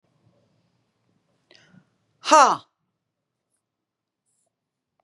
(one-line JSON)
{"exhalation_length": "5.0 s", "exhalation_amplitude": 29852, "exhalation_signal_mean_std_ratio": 0.16, "survey_phase": "beta (2021-08-13 to 2022-03-07)", "age": "45-64", "gender": "Female", "wearing_mask": "No", "symptom_none": true, "smoker_status": "Ex-smoker", "respiratory_condition_asthma": false, "respiratory_condition_other": false, "recruitment_source": "REACT", "submission_delay": "2 days", "covid_test_result": "Negative", "covid_test_method": "RT-qPCR", "influenza_a_test_result": "Negative", "influenza_b_test_result": "Negative"}